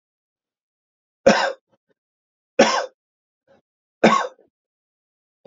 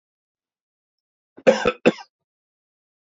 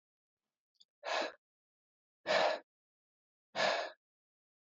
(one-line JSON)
{"three_cough_length": "5.5 s", "three_cough_amplitude": 31458, "three_cough_signal_mean_std_ratio": 0.26, "cough_length": "3.1 s", "cough_amplitude": 32532, "cough_signal_mean_std_ratio": 0.21, "exhalation_length": "4.8 s", "exhalation_amplitude": 3638, "exhalation_signal_mean_std_ratio": 0.34, "survey_phase": "alpha (2021-03-01 to 2021-08-12)", "age": "45-64", "gender": "Male", "wearing_mask": "No", "symptom_none": true, "smoker_status": "Ex-smoker", "respiratory_condition_asthma": false, "respiratory_condition_other": false, "recruitment_source": "REACT", "submission_delay": "1 day", "covid_test_result": "Negative", "covid_test_method": "RT-qPCR"}